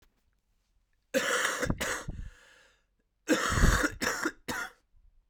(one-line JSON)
{"cough_length": "5.3 s", "cough_amplitude": 11117, "cough_signal_mean_std_ratio": 0.48, "survey_phase": "beta (2021-08-13 to 2022-03-07)", "age": "18-44", "gender": "Male", "wearing_mask": "No", "symptom_cough_any": true, "symptom_loss_of_taste": true, "symptom_onset": "10 days", "smoker_status": "Never smoked", "respiratory_condition_asthma": false, "respiratory_condition_other": false, "recruitment_source": "Test and Trace", "submission_delay": "2 days", "covid_test_result": "Positive", "covid_test_method": "ePCR"}